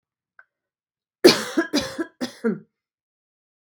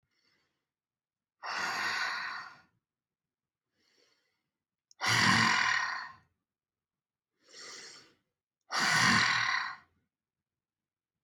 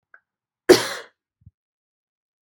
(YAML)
three_cough_length: 3.7 s
three_cough_amplitude: 32768
three_cough_signal_mean_std_ratio: 0.28
exhalation_length: 11.2 s
exhalation_amplitude: 7946
exhalation_signal_mean_std_ratio: 0.41
cough_length: 2.4 s
cough_amplitude: 32742
cough_signal_mean_std_ratio: 0.18
survey_phase: beta (2021-08-13 to 2022-03-07)
age: 45-64
gender: Female
wearing_mask: 'No'
symptom_none: true
smoker_status: Ex-smoker
respiratory_condition_asthma: false
respiratory_condition_other: true
recruitment_source: REACT
submission_delay: 0 days
covid_test_result: Negative
covid_test_method: RT-qPCR